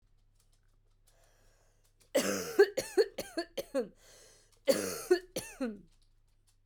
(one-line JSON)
{"cough_length": "6.7 s", "cough_amplitude": 7784, "cough_signal_mean_std_ratio": 0.34, "survey_phase": "alpha (2021-03-01 to 2021-08-12)", "age": "45-64", "gender": "Female", "wearing_mask": "No", "symptom_cough_any": true, "symptom_fatigue": true, "symptom_fever_high_temperature": true, "symptom_headache": true, "symptom_onset": "3 days", "smoker_status": "Never smoked", "respiratory_condition_asthma": false, "respiratory_condition_other": false, "recruitment_source": "Test and Trace", "submission_delay": "1 day", "covid_test_result": "Positive", "covid_test_method": "RT-qPCR", "covid_ct_value": 17.8, "covid_ct_gene": "ORF1ab gene", "covid_ct_mean": 18.4, "covid_viral_load": "940000 copies/ml", "covid_viral_load_category": "Low viral load (10K-1M copies/ml)"}